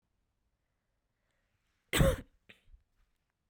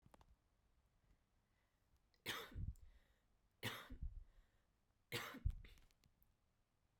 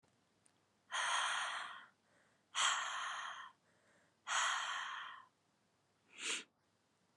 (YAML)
cough_length: 3.5 s
cough_amplitude: 7495
cough_signal_mean_std_ratio: 0.21
three_cough_length: 7.0 s
three_cough_amplitude: 1028
three_cough_signal_mean_std_ratio: 0.37
exhalation_length: 7.2 s
exhalation_amplitude: 2566
exhalation_signal_mean_std_ratio: 0.52
survey_phase: beta (2021-08-13 to 2022-03-07)
age: 18-44
gender: Female
wearing_mask: 'No'
symptom_cough_any: true
symptom_runny_or_blocked_nose: true
symptom_sore_throat: true
symptom_abdominal_pain: true
symptom_diarrhoea: true
symptom_fatigue: true
symptom_fever_high_temperature: true
symptom_headache: true
symptom_onset: 3 days
smoker_status: Never smoked
respiratory_condition_asthma: false
respiratory_condition_other: false
recruitment_source: Test and Trace
submission_delay: 2 days
covid_test_result: Positive
covid_test_method: RT-qPCR
covid_ct_value: 22.2
covid_ct_gene: ORF1ab gene